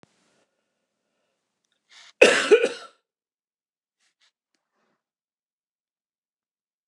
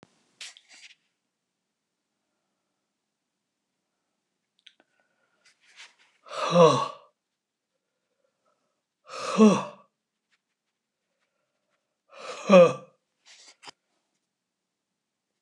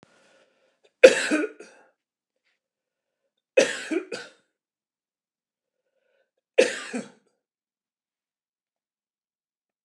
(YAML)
cough_length: 6.9 s
cough_amplitude: 29203
cough_signal_mean_std_ratio: 0.18
exhalation_length: 15.4 s
exhalation_amplitude: 21884
exhalation_signal_mean_std_ratio: 0.2
three_cough_length: 9.8 s
three_cough_amplitude: 29204
three_cough_signal_mean_std_ratio: 0.19
survey_phase: beta (2021-08-13 to 2022-03-07)
age: 65+
gender: Male
wearing_mask: 'No'
symptom_sore_throat: true
symptom_fatigue: true
symptom_headache: true
smoker_status: Never smoked
respiratory_condition_asthma: false
respiratory_condition_other: false
recruitment_source: REACT
submission_delay: 2 days
covid_test_result: Negative
covid_test_method: RT-qPCR
influenza_a_test_result: Unknown/Void
influenza_b_test_result: Unknown/Void